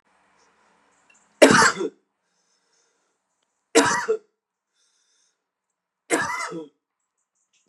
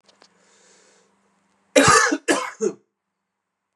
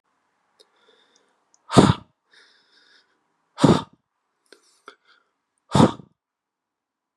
{
  "three_cough_length": "7.7 s",
  "three_cough_amplitude": 32759,
  "three_cough_signal_mean_std_ratio": 0.27,
  "cough_length": "3.8 s",
  "cough_amplitude": 31781,
  "cough_signal_mean_std_ratio": 0.33,
  "exhalation_length": "7.2 s",
  "exhalation_amplitude": 32768,
  "exhalation_signal_mean_std_ratio": 0.21,
  "survey_phase": "beta (2021-08-13 to 2022-03-07)",
  "age": "18-44",
  "gender": "Male",
  "wearing_mask": "No",
  "symptom_cough_any": true,
  "symptom_new_continuous_cough": true,
  "symptom_runny_or_blocked_nose": true,
  "symptom_sore_throat": true,
  "symptom_headache": true,
  "symptom_onset": "5 days",
  "smoker_status": "Current smoker (1 to 10 cigarettes per day)",
  "respiratory_condition_asthma": false,
  "respiratory_condition_other": false,
  "recruitment_source": "Test and Trace",
  "submission_delay": "2 days",
  "covid_test_result": "Positive",
  "covid_test_method": "ePCR"
}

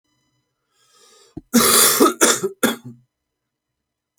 {
  "cough_length": "4.2 s",
  "cough_amplitude": 32768,
  "cough_signal_mean_std_ratio": 0.39,
  "survey_phase": "alpha (2021-03-01 to 2021-08-12)",
  "age": "18-44",
  "gender": "Male",
  "wearing_mask": "No",
  "symptom_new_continuous_cough": true,
  "symptom_shortness_of_breath": true,
  "symptom_fever_high_temperature": true,
  "symptom_headache": true,
  "symptom_onset": "3 days",
  "smoker_status": "Never smoked",
  "respiratory_condition_asthma": true,
  "respiratory_condition_other": false,
  "recruitment_source": "Test and Trace",
  "submission_delay": "2 days",
  "covid_test_result": "Positive",
  "covid_test_method": "RT-qPCR",
  "covid_ct_value": 18.2,
  "covid_ct_gene": "ORF1ab gene"
}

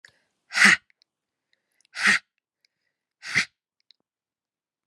{
  "exhalation_length": "4.9 s",
  "exhalation_amplitude": 29686,
  "exhalation_signal_mean_std_ratio": 0.25,
  "survey_phase": "beta (2021-08-13 to 2022-03-07)",
  "age": "18-44",
  "gender": "Female",
  "wearing_mask": "No",
  "symptom_runny_or_blocked_nose": true,
  "symptom_fatigue": true,
  "symptom_headache": true,
  "symptom_change_to_sense_of_smell_or_taste": true,
  "symptom_loss_of_taste": true,
  "symptom_onset": "6 days",
  "smoker_status": "Ex-smoker",
  "respiratory_condition_asthma": false,
  "respiratory_condition_other": false,
  "recruitment_source": "Test and Trace",
  "submission_delay": "2 days",
  "covid_test_result": "Positive",
  "covid_test_method": "RT-qPCR",
  "covid_ct_value": 19.8,
  "covid_ct_gene": "ORF1ab gene"
}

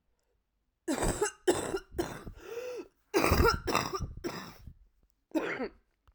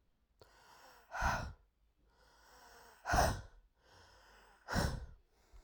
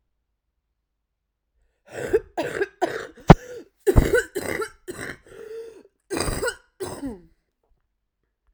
{
  "three_cough_length": "6.1 s",
  "three_cough_amplitude": 9702,
  "three_cough_signal_mean_std_ratio": 0.5,
  "exhalation_length": "5.6 s",
  "exhalation_amplitude": 3511,
  "exhalation_signal_mean_std_ratio": 0.37,
  "cough_length": "8.5 s",
  "cough_amplitude": 32768,
  "cough_signal_mean_std_ratio": 0.29,
  "survey_phase": "alpha (2021-03-01 to 2021-08-12)",
  "age": "18-44",
  "gender": "Female",
  "wearing_mask": "No",
  "symptom_cough_any": true,
  "symptom_fatigue": true,
  "symptom_fever_high_temperature": true,
  "symptom_headache": true,
  "symptom_change_to_sense_of_smell_or_taste": true,
  "symptom_onset": "5 days",
  "smoker_status": "Current smoker (1 to 10 cigarettes per day)",
  "respiratory_condition_asthma": false,
  "respiratory_condition_other": false,
  "recruitment_source": "Test and Trace",
  "submission_delay": "2 days",
  "covid_test_result": "Positive",
  "covid_test_method": "RT-qPCR",
  "covid_ct_value": 20.7,
  "covid_ct_gene": "ORF1ab gene",
  "covid_ct_mean": 21.4,
  "covid_viral_load": "97000 copies/ml",
  "covid_viral_load_category": "Low viral load (10K-1M copies/ml)"
}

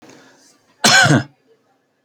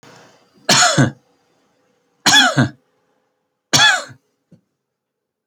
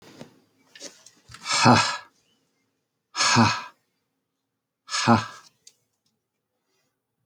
{
  "cough_length": "2.0 s",
  "cough_amplitude": 30420,
  "cough_signal_mean_std_ratio": 0.37,
  "three_cough_length": "5.5 s",
  "three_cough_amplitude": 32645,
  "three_cough_signal_mean_std_ratio": 0.37,
  "exhalation_length": "7.3 s",
  "exhalation_amplitude": 23007,
  "exhalation_signal_mean_std_ratio": 0.32,
  "survey_phase": "alpha (2021-03-01 to 2021-08-12)",
  "age": "45-64",
  "gender": "Male",
  "wearing_mask": "No",
  "symptom_none": true,
  "smoker_status": "Never smoked",
  "respiratory_condition_asthma": false,
  "respiratory_condition_other": false,
  "recruitment_source": "REACT",
  "submission_delay": "2 days",
  "covid_test_result": "Negative",
  "covid_test_method": "RT-qPCR"
}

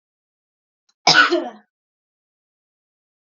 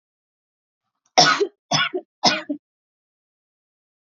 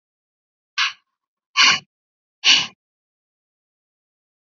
{
  "cough_length": "3.3 s",
  "cough_amplitude": 30252,
  "cough_signal_mean_std_ratio": 0.25,
  "three_cough_length": "4.0 s",
  "three_cough_amplitude": 30732,
  "three_cough_signal_mean_std_ratio": 0.31,
  "exhalation_length": "4.4 s",
  "exhalation_amplitude": 29612,
  "exhalation_signal_mean_std_ratio": 0.27,
  "survey_phase": "beta (2021-08-13 to 2022-03-07)",
  "age": "18-44",
  "gender": "Female",
  "wearing_mask": "No",
  "symptom_fatigue": true,
  "symptom_headache": true,
  "symptom_other": true,
  "smoker_status": "Never smoked",
  "respiratory_condition_asthma": false,
  "respiratory_condition_other": false,
  "recruitment_source": "Test and Trace",
  "submission_delay": "1 day",
  "covid_test_result": "Positive",
  "covid_test_method": "RT-qPCR",
  "covid_ct_value": 32.1,
  "covid_ct_gene": "N gene"
}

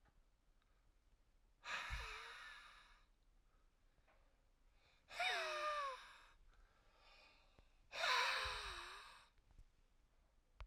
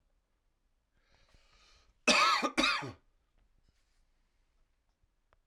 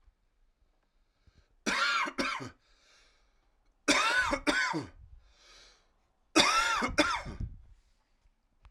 {
  "exhalation_length": "10.7 s",
  "exhalation_amplitude": 1406,
  "exhalation_signal_mean_std_ratio": 0.45,
  "cough_length": "5.5 s",
  "cough_amplitude": 6754,
  "cough_signal_mean_std_ratio": 0.29,
  "three_cough_length": "8.7 s",
  "three_cough_amplitude": 13155,
  "three_cough_signal_mean_std_ratio": 0.45,
  "survey_phase": "beta (2021-08-13 to 2022-03-07)",
  "age": "18-44",
  "gender": "Male",
  "wearing_mask": "No",
  "symptom_cough_any": true,
  "symptom_fatigue": true,
  "symptom_headache": true,
  "symptom_change_to_sense_of_smell_or_taste": true,
  "symptom_loss_of_taste": true,
  "symptom_onset": "3 days",
  "smoker_status": "Ex-smoker",
  "respiratory_condition_asthma": false,
  "respiratory_condition_other": false,
  "recruitment_source": "Test and Trace",
  "submission_delay": "1 day",
  "covid_test_result": "Positive",
  "covid_test_method": "RT-qPCR"
}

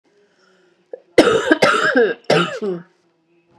{
  "three_cough_length": "3.6 s",
  "three_cough_amplitude": 32768,
  "three_cough_signal_mean_std_ratio": 0.48,
  "survey_phase": "beta (2021-08-13 to 2022-03-07)",
  "age": "18-44",
  "gender": "Female",
  "wearing_mask": "No",
  "symptom_cough_any": true,
  "symptom_runny_or_blocked_nose": true,
  "symptom_shortness_of_breath": true,
  "symptom_headache": true,
  "symptom_change_to_sense_of_smell_or_taste": true,
  "symptom_onset": "2 days",
  "smoker_status": "Ex-smoker",
  "respiratory_condition_asthma": false,
  "respiratory_condition_other": false,
  "recruitment_source": "Test and Trace",
  "submission_delay": "1 day",
  "covid_test_result": "Positive",
  "covid_test_method": "RT-qPCR",
  "covid_ct_value": 27.6,
  "covid_ct_gene": "ORF1ab gene",
  "covid_ct_mean": 28.2,
  "covid_viral_load": "540 copies/ml",
  "covid_viral_load_category": "Minimal viral load (< 10K copies/ml)"
}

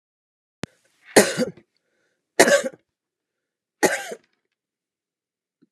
{
  "three_cough_length": "5.7 s",
  "three_cough_amplitude": 32664,
  "three_cough_signal_mean_std_ratio": 0.25,
  "survey_phase": "alpha (2021-03-01 to 2021-08-12)",
  "age": "45-64",
  "gender": "Female",
  "wearing_mask": "No",
  "symptom_fatigue": true,
  "smoker_status": "Never smoked",
  "respiratory_condition_asthma": false,
  "respiratory_condition_other": false,
  "recruitment_source": "REACT",
  "submission_delay": "1 day",
  "covid_test_result": "Negative",
  "covid_test_method": "RT-qPCR"
}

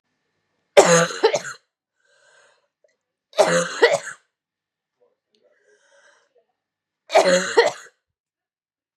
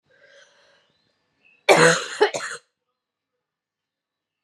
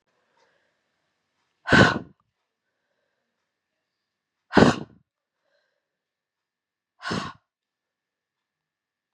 {
  "three_cough_length": "9.0 s",
  "three_cough_amplitude": 32768,
  "three_cough_signal_mean_std_ratio": 0.31,
  "cough_length": "4.4 s",
  "cough_amplitude": 29031,
  "cough_signal_mean_std_ratio": 0.27,
  "exhalation_length": "9.1 s",
  "exhalation_amplitude": 30064,
  "exhalation_signal_mean_std_ratio": 0.19,
  "survey_phase": "beta (2021-08-13 to 2022-03-07)",
  "age": "18-44",
  "gender": "Female",
  "wearing_mask": "No",
  "symptom_cough_any": true,
  "symptom_new_continuous_cough": true,
  "symptom_runny_or_blocked_nose": true,
  "symptom_shortness_of_breath": true,
  "symptom_sore_throat": true,
  "symptom_abdominal_pain": true,
  "symptom_fatigue": true,
  "symptom_fever_high_temperature": true,
  "symptom_headache": true,
  "symptom_change_to_sense_of_smell_or_taste": true,
  "symptom_loss_of_taste": true,
  "symptom_other": true,
  "symptom_onset": "3 days",
  "smoker_status": "Never smoked",
  "respiratory_condition_asthma": true,
  "respiratory_condition_other": false,
  "recruitment_source": "Test and Trace",
  "submission_delay": "2 days",
  "covid_test_result": "Positive",
  "covid_test_method": "RT-qPCR",
  "covid_ct_value": 15.4,
  "covid_ct_gene": "ORF1ab gene",
  "covid_ct_mean": 16.7,
  "covid_viral_load": "3300000 copies/ml",
  "covid_viral_load_category": "High viral load (>1M copies/ml)"
}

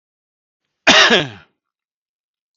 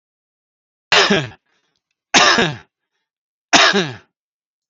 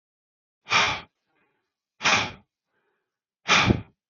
{
  "cough_length": "2.6 s",
  "cough_amplitude": 29444,
  "cough_signal_mean_std_ratio": 0.31,
  "three_cough_length": "4.7 s",
  "three_cough_amplitude": 32767,
  "three_cough_signal_mean_std_ratio": 0.37,
  "exhalation_length": "4.1 s",
  "exhalation_amplitude": 20957,
  "exhalation_signal_mean_std_ratio": 0.35,
  "survey_phase": "alpha (2021-03-01 to 2021-08-12)",
  "age": "45-64",
  "gender": "Male",
  "wearing_mask": "No",
  "symptom_none": true,
  "smoker_status": "Ex-smoker",
  "respiratory_condition_asthma": false,
  "respiratory_condition_other": false,
  "recruitment_source": "REACT",
  "submission_delay": "1 day",
  "covid_test_result": "Negative",
  "covid_test_method": "RT-qPCR"
}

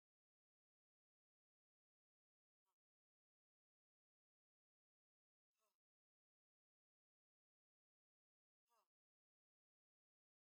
{
  "exhalation_length": "10.5 s",
  "exhalation_amplitude": 8,
  "exhalation_signal_mean_std_ratio": 0.12,
  "survey_phase": "beta (2021-08-13 to 2022-03-07)",
  "age": "45-64",
  "gender": "Female",
  "wearing_mask": "No",
  "symptom_none": true,
  "smoker_status": "Never smoked",
  "respiratory_condition_asthma": false,
  "respiratory_condition_other": false,
  "recruitment_source": "REACT",
  "submission_delay": "1 day",
  "covid_test_result": "Negative",
  "covid_test_method": "RT-qPCR"
}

